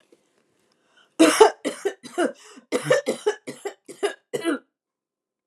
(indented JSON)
{
  "cough_length": "5.5 s",
  "cough_amplitude": 32109,
  "cough_signal_mean_std_ratio": 0.35,
  "survey_phase": "beta (2021-08-13 to 2022-03-07)",
  "age": "65+",
  "gender": "Female",
  "wearing_mask": "No",
  "symptom_none": true,
  "smoker_status": "Never smoked",
  "respiratory_condition_asthma": false,
  "respiratory_condition_other": false,
  "recruitment_source": "REACT",
  "submission_delay": "1 day",
  "covid_test_result": "Negative",
  "covid_test_method": "RT-qPCR",
  "influenza_a_test_result": "Unknown/Void",
  "influenza_b_test_result": "Unknown/Void"
}